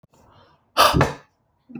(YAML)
exhalation_length: 1.8 s
exhalation_amplitude: 31034
exhalation_signal_mean_std_ratio: 0.35
survey_phase: alpha (2021-03-01 to 2021-08-12)
age: 18-44
gender: Male
wearing_mask: 'No'
symptom_none: true
smoker_status: Ex-smoker
respiratory_condition_asthma: false
respiratory_condition_other: false
recruitment_source: REACT
submission_delay: 2 days
covid_test_result: Negative
covid_test_method: RT-qPCR